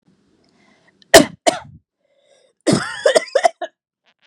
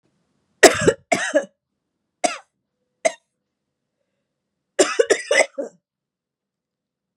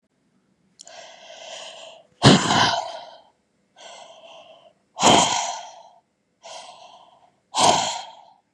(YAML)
cough_length: 4.3 s
cough_amplitude: 32768
cough_signal_mean_std_ratio: 0.29
three_cough_length: 7.2 s
three_cough_amplitude: 32768
three_cough_signal_mean_std_ratio: 0.27
exhalation_length: 8.5 s
exhalation_amplitude: 32126
exhalation_signal_mean_std_ratio: 0.36
survey_phase: beta (2021-08-13 to 2022-03-07)
age: 18-44
gender: Female
wearing_mask: 'No'
symptom_none: true
symptom_onset: 11 days
smoker_status: Never smoked
respiratory_condition_asthma: false
respiratory_condition_other: false
recruitment_source: REACT
submission_delay: 1 day
covid_test_result: Negative
covid_test_method: RT-qPCR
influenza_a_test_result: Negative
influenza_b_test_result: Negative